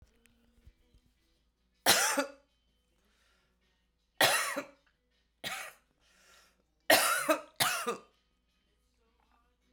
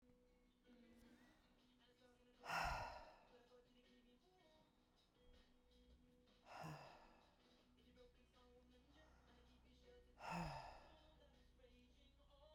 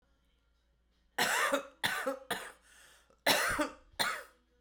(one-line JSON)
{"three_cough_length": "9.7 s", "three_cough_amplitude": 14831, "three_cough_signal_mean_std_ratio": 0.32, "exhalation_length": "12.5 s", "exhalation_amplitude": 669, "exhalation_signal_mean_std_ratio": 0.42, "cough_length": "4.6 s", "cough_amplitude": 6870, "cough_signal_mean_std_ratio": 0.48, "survey_phase": "beta (2021-08-13 to 2022-03-07)", "age": "45-64", "gender": "Female", "wearing_mask": "No", "symptom_cough_any": true, "symptom_runny_or_blocked_nose": true, "symptom_sore_throat": true, "symptom_fatigue": true, "symptom_fever_high_temperature": true, "symptom_headache": true, "symptom_change_to_sense_of_smell_or_taste": true, "symptom_onset": "5 days", "smoker_status": "Current smoker (11 or more cigarettes per day)", "respiratory_condition_asthma": false, "respiratory_condition_other": false, "recruitment_source": "Test and Trace", "submission_delay": "2 days", "covid_test_result": "Positive", "covid_test_method": "RT-qPCR", "covid_ct_value": 20.7, "covid_ct_gene": "ORF1ab gene"}